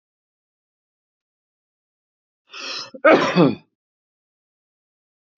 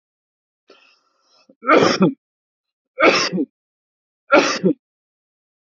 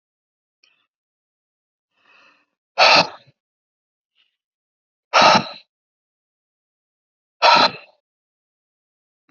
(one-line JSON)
{"cough_length": "5.4 s", "cough_amplitude": 27686, "cough_signal_mean_std_ratio": 0.24, "three_cough_length": "5.7 s", "three_cough_amplitude": 30408, "three_cough_signal_mean_std_ratio": 0.35, "exhalation_length": "9.3 s", "exhalation_amplitude": 32169, "exhalation_signal_mean_std_ratio": 0.24, "survey_phase": "beta (2021-08-13 to 2022-03-07)", "age": "65+", "gender": "Male", "wearing_mask": "No", "symptom_none": true, "smoker_status": "Current smoker (e-cigarettes or vapes only)", "respiratory_condition_asthma": false, "respiratory_condition_other": false, "recruitment_source": "REACT", "submission_delay": "2 days", "covid_test_result": "Negative", "covid_test_method": "RT-qPCR"}